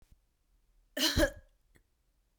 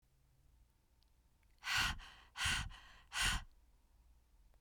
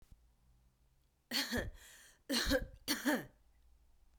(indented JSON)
{
  "cough_length": "2.4 s",
  "cough_amplitude": 6786,
  "cough_signal_mean_std_ratio": 0.3,
  "exhalation_length": "4.6 s",
  "exhalation_amplitude": 2211,
  "exhalation_signal_mean_std_ratio": 0.42,
  "three_cough_length": "4.2 s",
  "three_cough_amplitude": 2831,
  "three_cough_signal_mean_std_ratio": 0.44,
  "survey_phase": "beta (2021-08-13 to 2022-03-07)",
  "age": "18-44",
  "gender": "Female",
  "wearing_mask": "No",
  "symptom_cough_any": true,
  "symptom_runny_or_blocked_nose": true,
  "symptom_fatigue": true,
  "symptom_onset": "6 days",
  "smoker_status": "Current smoker (1 to 10 cigarettes per day)",
  "respiratory_condition_asthma": false,
  "respiratory_condition_other": false,
  "recruitment_source": "Test and Trace",
  "submission_delay": "2 days",
  "covid_test_result": "Positive",
  "covid_test_method": "RT-qPCR"
}